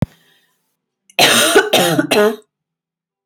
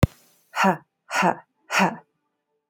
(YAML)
cough_length: 3.3 s
cough_amplitude: 32125
cough_signal_mean_std_ratio: 0.49
exhalation_length: 2.7 s
exhalation_amplitude: 25546
exhalation_signal_mean_std_ratio: 0.37
survey_phase: alpha (2021-03-01 to 2021-08-12)
age: 18-44
gender: Female
wearing_mask: 'No'
symptom_none: true
smoker_status: Never smoked
respiratory_condition_asthma: false
respiratory_condition_other: false
recruitment_source: REACT
submission_delay: 3 days
covid_test_result: Negative
covid_test_method: RT-qPCR